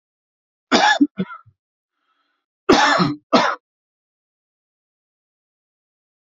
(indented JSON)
{
  "cough_length": "6.2 s",
  "cough_amplitude": 31180,
  "cough_signal_mean_std_ratio": 0.32,
  "survey_phase": "alpha (2021-03-01 to 2021-08-12)",
  "age": "45-64",
  "gender": "Male",
  "wearing_mask": "No",
  "symptom_none": true,
  "smoker_status": "Ex-smoker",
  "respiratory_condition_asthma": false,
  "respiratory_condition_other": false,
  "recruitment_source": "REACT",
  "submission_delay": "1 day",
  "covid_test_result": "Negative",
  "covid_test_method": "RT-qPCR"
}